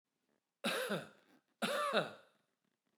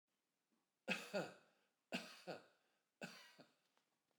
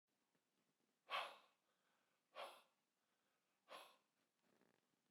{"cough_length": "3.0 s", "cough_amplitude": 4103, "cough_signal_mean_std_ratio": 0.45, "three_cough_length": "4.2 s", "three_cough_amplitude": 1225, "three_cough_signal_mean_std_ratio": 0.33, "exhalation_length": "5.1 s", "exhalation_amplitude": 719, "exhalation_signal_mean_std_ratio": 0.26, "survey_phase": "beta (2021-08-13 to 2022-03-07)", "age": "65+", "gender": "Male", "wearing_mask": "No", "symptom_none": true, "smoker_status": "Never smoked", "respiratory_condition_asthma": false, "respiratory_condition_other": false, "recruitment_source": "REACT", "submission_delay": "1 day", "covid_test_result": "Negative", "covid_test_method": "RT-qPCR", "influenza_a_test_result": "Negative", "influenza_b_test_result": "Negative"}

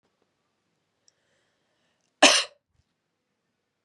{"cough_length": "3.8 s", "cough_amplitude": 29029, "cough_signal_mean_std_ratio": 0.17, "survey_phase": "beta (2021-08-13 to 2022-03-07)", "age": "18-44", "gender": "Female", "wearing_mask": "No", "symptom_none": true, "smoker_status": "Never smoked", "respiratory_condition_asthma": false, "respiratory_condition_other": false, "recruitment_source": "REACT", "submission_delay": "2 days", "covid_test_result": "Negative", "covid_test_method": "RT-qPCR"}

